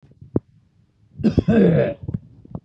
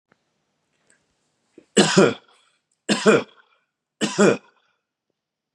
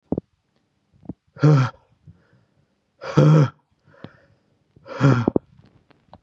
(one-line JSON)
{"cough_length": "2.6 s", "cough_amplitude": 21665, "cough_signal_mean_std_ratio": 0.45, "three_cough_length": "5.5 s", "three_cough_amplitude": 32322, "three_cough_signal_mean_std_ratio": 0.31, "exhalation_length": "6.2 s", "exhalation_amplitude": 26024, "exhalation_signal_mean_std_ratio": 0.33, "survey_phase": "beta (2021-08-13 to 2022-03-07)", "age": "45-64", "gender": "Male", "wearing_mask": "No", "symptom_fatigue": true, "symptom_headache": true, "symptom_onset": "12 days", "smoker_status": "Never smoked", "respiratory_condition_asthma": false, "respiratory_condition_other": false, "recruitment_source": "REACT", "submission_delay": "1 day", "covid_test_result": "Negative", "covid_test_method": "RT-qPCR", "influenza_a_test_result": "Negative", "influenza_b_test_result": "Negative"}